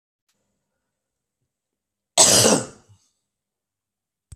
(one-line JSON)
{"cough_length": "4.4 s", "cough_amplitude": 32768, "cough_signal_mean_std_ratio": 0.25, "survey_phase": "beta (2021-08-13 to 2022-03-07)", "age": "65+", "gender": "Male", "wearing_mask": "No", "symptom_none": true, "smoker_status": "Never smoked", "respiratory_condition_asthma": false, "respiratory_condition_other": false, "recruitment_source": "REACT", "submission_delay": "0 days", "covid_test_result": "Negative", "covid_test_method": "RT-qPCR"}